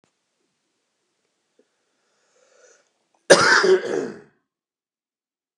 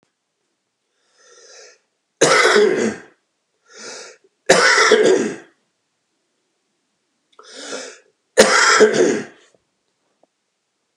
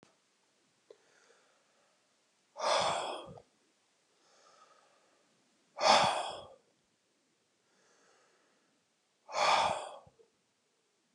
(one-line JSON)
{"cough_length": "5.6 s", "cough_amplitude": 32768, "cough_signal_mean_std_ratio": 0.26, "three_cough_length": "11.0 s", "three_cough_amplitude": 32768, "three_cough_signal_mean_std_ratio": 0.4, "exhalation_length": "11.1 s", "exhalation_amplitude": 9772, "exhalation_signal_mean_std_ratio": 0.3, "survey_phase": "beta (2021-08-13 to 2022-03-07)", "age": "65+", "gender": "Male", "wearing_mask": "No", "symptom_none": true, "smoker_status": "Ex-smoker", "respiratory_condition_asthma": false, "respiratory_condition_other": false, "recruitment_source": "REACT", "submission_delay": "1 day", "covid_test_result": "Negative", "covid_test_method": "RT-qPCR"}